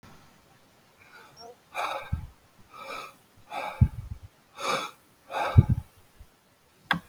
{"exhalation_length": "7.1 s", "exhalation_amplitude": 22353, "exhalation_signal_mean_std_ratio": 0.3, "survey_phase": "beta (2021-08-13 to 2022-03-07)", "age": "65+", "gender": "Male", "wearing_mask": "No", "symptom_none": true, "smoker_status": "Ex-smoker", "respiratory_condition_asthma": false, "respiratory_condition_other": false, "recruitment_source": "REACT", "submission_delay": "5 days", "covid_test_result": "Negative", "covid_test_method": "RT-qPCR"}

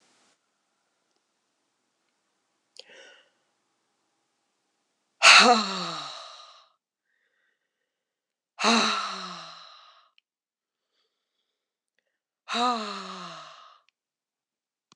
{"exhalation_length": "15.0 s", "exhalation_amplitude": 26027, "exhalation_signal_mean_std_ratio": 0.24, "survey_phase": "alpha (2021-03-01 to 2021-08-12)", "age": "45-64", "gender": "Female", "wearing_mask": "No", "symptom_cough_any": true, "symptom_fatigue": true, "symptom_headache": true, "smoker_status": "Never smoked", "respiratory_condition_asthma": false, "respiratory_condition_other": false, "recruitment_source": "Test and Trace", "submission_delay": "1 day", "covid_test_result": "Positive", "covid_test_method": "RT-qPCR", "covid_ct_value": 19.0, "covid_ct_gene": "ORF1ab gene"}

